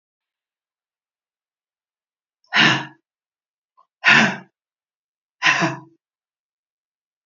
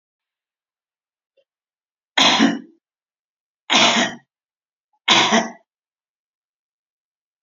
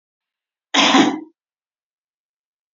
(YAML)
exhalation_length: 7.3 s
exhalation_amplitude: 29610
exhalation_signal_mean_std_ratio: 0.27
three_cough_length: 7.4 s
three_cough_amplitude: 30600
three_cough_signal_mean_std_ratio: 0.32
cough_length: 2.7 s
cough_amplitude: 28811
cough_signal_mean_std_ratio: 0.32
survey_phase: beta (2021-08-13 to 2022-03-07)
age: 65+
gender: Female
wearing_mask: 'No'
symptom_fatigue: true
symptom_change_to_sense_of_smell_or_taste: true
symptom_onset: 3 days
smoker_status: Never smoked
respiratory_condition_asthma: false
respiratory_condition_other: false
recruitment_source: REACT
submission_delay: 2 days
covid_test_result: Negative
covid_test_method: RT-qPCR
influenza_a_test_result: Negative
influenza_b_test_result: Negative